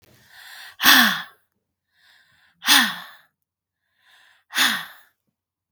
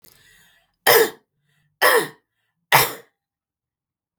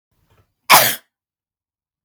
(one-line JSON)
{"exhalation_length": "5.7 s", "exhalation_amplitude": 32768, "exhalation_signal_mean_std_ratio": 0.31, "three_cough_length": "4.2 s", "three_cough_amplitude": 32768, "three_cough_signal_mean_std_ratio": 0.31, "cough_length": "2.0 s", "cough_amplitude": 32768, "cough_signal_mean_std_ratio": 0.26, "survey_phase": "beta (2021-08-13 to 2022-03-07)", "age": "45-64", "gender": "Female", "wearing_mask": "No", "symptom_none": true, "smoker_status": "Never smoked", "respiratory_condition_asthma": false, "respiratory_condition_other": false, "recruitment_source": "REACT", "submission_delay": "3 days", "covid_test_result": "Negative", "covid_test_method": "RT-qPCR", "influenza_a_test_result": "Unknown/Void", "influenza_b_test_result": "Unknown/Void"}